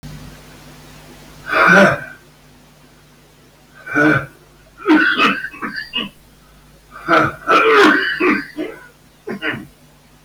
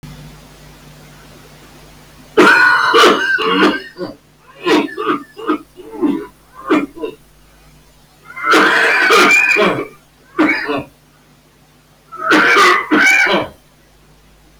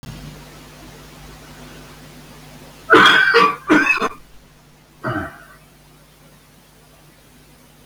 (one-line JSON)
{"exhalation_length": "10.2 s", "exhalation_amplitude": 32768, "exhalation_signal_mean_std_ratio": 0.49, "three_cough_length": "14.6 s", "three_cough_amplitude": 32768, "three_cough_signal_mean_std_ratio": 0.59, "cough_length": "7.9 s", "cough_amplitude": 32768, "cough_signal_mean_std_ratio": 0.37, "survey_phase": "beta (2021-08-13 to 2022-03-07)", "age": "45-64", "gender": "Male", "wearing_mask": "No", "symptom_cough_any": true, "symptom_new_continuous_cough": true, "symptom_runny_or_blocked_nose": true, "symptom_shortness_of_breath": true, "symptom_other": true, "symptom_onset": "12 days", "smoker_status": "Current smoker (11 or more cigarettes per day)", "respiratory_condition_asthma": true, "respiratory_condition_other": true, "recruitment_source": "REACT", "submission_delay": "2 days", "covid_test_result": "Negative", "covid_test_method": "RT-qPCR", "influenza_a_test_result": "Negative", "influenza_b_test_result": "Negative"}